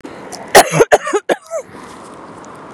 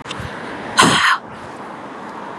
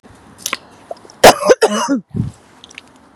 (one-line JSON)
{"cough_length": "2.7 s", "cough_amplitude": 32768, "cough_signal_mean_std_ratio": 0.41, "exhalation_length": "2.4 s", "exhalation_amplitude": 32768, "exhalation_signal_mean_std_ratio": 0.57, "three_cough_length": "3.2 s", "three_cough_amplitude": 32768, "three_cough_signal_mean_std_ratio": 0.36, "survey_phase": "beta (2021-08-13 to 2022-03-07)", "age": "18-44", "gender": "Female", "wearing_mask": "No", "symptom_abdominal_pain": true, "symptom_onset": "13 days", "smoker_status": "Never smoked", "respiratory_condition_asthma": false, "respiratory_condition_other": false, "recruitment_source": "REACT", "submission_delay": "1 day", "covid_test_result": "Negative", "covid_test_method": "RT-qPCR", "influenza_a_test_result": "Negative", "influenza_b_test_result": "Negative"}